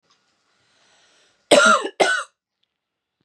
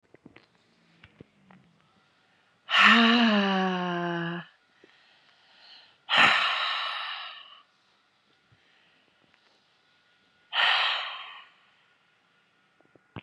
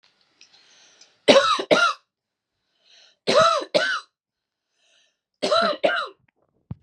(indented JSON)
{
  "cough_length": "3.2 s",
  "cough_amplitude": 31311,
  "cough_signal_mean_std_ratio": 0.32,
  "exhalation_length": "13.2 s",
  "exhalation_amplitude": 19796,
  "exhalation_signal_mean_std_ratio": 0.39,
  "three_cough_length": "6.8 s",
  "three_cough_amplitude": 31880,
  "three_cough_signal_mean_std_ratio": 0.39,
  "survey_phase": "beta (2021-08-13 to 2022-03-07)",
  "age": "18-44",
  "gender": "Female",
  "wearing_mask": "No",
  "symptom_runny_or_blocked_nose": true,
  "symptom_onset": "11 days",
  "smoker_status": "Ex-smoker",
  "respiratory_condition_asthma": false,
  "respiratory_condition_other": false,
  "recruitment_source": "REACT",
  "submission_delay": "1 day",
  "covid_test_result": "Negative",
  "covid_test_method": "RT-qPCR",
  "influenza_a_test_result": "Negative",
  "influenza_b_test_result": "Negative"
}